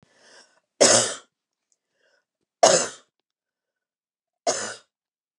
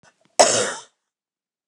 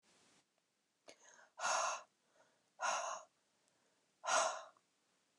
{"three_cough_length": "5.4 s", "three_cough_amplitude": 26087, "three_cough_signal_mean_std_ratio": 0.27, "cough_length": "1.7 s", "cough_amplitude": 29204, "cough_signal_mean_std_ratio": 0.32, "exhalation_length": "5.4 s", "exhalation_amplitude": 2793, "exhalation_signal_mean_std_ratio": 0.38, "survey_phase": "beta (2021-08-13 to 2022-03-07)", "age": "45-64", "gender": "Female", "wearing_mask": "No", "symptom_none": true, "smoker_status": "Never smoked", "respiratory_condition_asthma": false, "respiratory_condition_other": false, "recruitment_source": "REACT", "submission_delay": "2 days", "covid_test_result": "Negative", "covid_test_method": "RT-qPCR", "influenza_a_test_result": "Negative", "influenza_b_test_result": "Negative"}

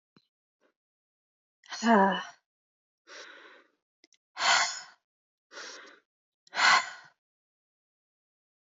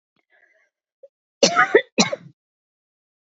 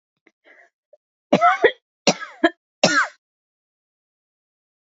{"exhalation_length": "8.7 s", "exhalation_amplitude": 11761, "exhalation_signal_mean_std_ratio": 0.28, "cough_length": "3.3 s", "cough_amplitude": 30466, "cough_signal_mean_std_ratio": 0.26, "three_cough_length": "4.9 s", "three_cough_amplitude": 29732, "three_cough_signal_mean_std_ratio": 0.28, "survey_phase": "alpha (2021-03-01 to 2021-08-12)", "age": "18-44", "gender": "Female", "wearing_mask": "No", "symptom_cough_any": true, "symptom_fatigue": true, "symptom_fever_high_temperature": true, "symptom_headache": true, "symptom_change_to_sense_of_smell_or_taste": true, "smoker_status": "Never smoked", "respiratory_condition_asthma": false, "respiratory_condition_other": false, "recruitment_source": "Test and Trace", "submission_delay": "1 day", "covid_test_result": "Positive", "covid_test_method": "RT-qPCR", "covid_ct_value": 19.5, "covid_ct_gene": "ORF1ab gene", "covid_ct_mean": 20.7, "covid_viral_load": "170000 copies/ml", "covid_viral_load_category": "Low viral load (10K-1M copies/ml)"}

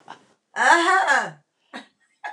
{"cough_length": "2.3 s", "cough_amplitude": 25071, "cough_signal_mean_std_ratio": 0.48, "survey_phase": "alpha (2021-03-01 to 2021-08-12)", "age": "65+", "gender": "Female", "wearing_mask": "No", "symptom_none": true, "smoker_status": "Ex-smoker", "respiratory_condition_asthma": false, "respiratory_condition_other": false, "recruitment_source": "REACT", "submission_delay": "4 days", "covid_test_result": "Negative", "covid_test_method": "RT-qPCR"}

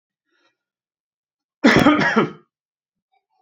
{"cough_length": "3.4 s", "cough_amplitude": 31441, "cough_signal_mean_std_ratio": 0.34, "survey_phase": "beta (2021-08-13 to 2022-03-07)", "age": "18-44", "gender": "Male", "wearing_mask": "No", "symptom_none": true, "smoker_status": "Never smoked", "respiratory_condition_asthma": false, "respiratory_condition_other": false, "recruitment_source": "REACT", "submission_delay": "1 day", "covid_test_result": "Negative", "covid_test_method": "RT-qPCR"}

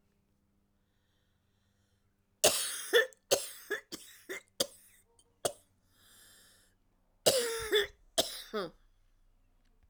{"cough_length": "9.9 s", "cough_amplitude": 11964, "cough_signal_mean_std_ratio": 0.31, "survey_phase": "alpha (2021-03-01 to 2021-08-12)", "age": "65+", "gender": "Female", "wearing_mask": "No", "symptom_cough_any": true, "symptom_fatigue": true, "symptom_headache": true, "smoker_status": "Never smoked", "respiratory_condition_asthma": true, "respiratory_condition_other": false, "recruitment_source": "REACT", "submission_delay": "3 days", "covid_test_result": "Negative", "covid_test_method": "RT-qPCR"}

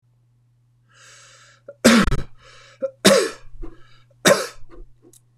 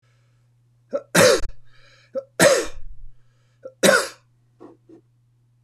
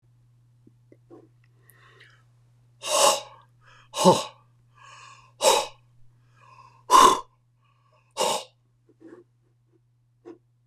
{"cough_length": "5.4 s", "cough_amplitude": 26028, "cough_signal_mean_std_ratio": 0.36, "three_cough_length": "5.6 s", "three_cough_amplitude": 26027, "three_cough_signal_mean_std_ratio": 0.37, "exhalation_length": "10.7 s", "exhalation_amplitude": 24685, "exhalation_signal_mean_std_ratio": 0.28, "survey_phase": "beta (2021-08-13 to 2022-03-07)", "age": "65+", "gender": "Male", "wearing_mask": "No", "symptom_runny_or_blocked_nose": true, "symptom_fatigue": true, "symptom_onset": "12 days", "smoker_status": "Never smoked", "respiratory_condition_asthma": false, "respiratory_condition_other": false, "recruitment_source": "REACT", "submission_delay": "1 day", "covid_test_result": "Negative", "covid_test_method": "RT-qPCR", "influenza_a_test_result": "Negative", "influenza_b_test_result": "Negative"}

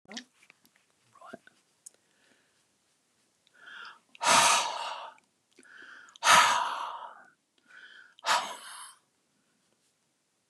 {"exhalation_length": "10.5 s", "exhalation_amplitude": 16809, "exhalation_signal_mean_std_ratio": 0.31, "survey_phase": "beta (2021-08-13 to 2022-03-07)", "age": "65+", "gender": "Male", "wearing_mask": "No", "symptom_none": true, "smoker_status": "Ex-smoker", "respiratory_condition_asthma": false, "respiratory_condition_other": false, "recruitment_source": "REACT", "submission_delay": "4 days", "covid_test_result": "Negative", "covid_test_method": "RT-qPCR", "influenza_a_test_result": "Negative", "influenza_b_test_result": "Negative"}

